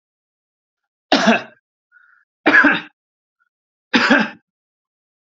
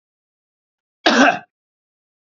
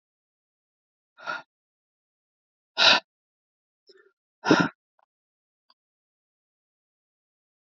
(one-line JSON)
{"three_cough_length": "5.3 s", "three_cough_amplitude": 29126, "three_cough_signal_mean_std_ratio": 0.34, "cough_length": "2.3 s", "cough_amplitude": 28502, "cough_signal_mean_std_ratio": 0.28, "exhalation_length": "7.8 s", "exhalation_amplitude": 21000, "exhalation_signal_mean_std_ratio": 0.19, "survey_phase": "beta (2021-08-13 to 2022-03-07)", "age": "45-64", "gender": "Male", "wearing_mask": "No", "symptom_none": true, "smoker_status": "Never smoked", "respiratory_condition_asthma": false, "respiratory_condition_other": false, "recruitment_source": "REACT", "submission_delay": "2 days", "covid_test_result": "Negative", "covid_test_method": "RT-qPCR", "influenza_a_test_result": "Negative", "influenza_b_test_result": "Negative"}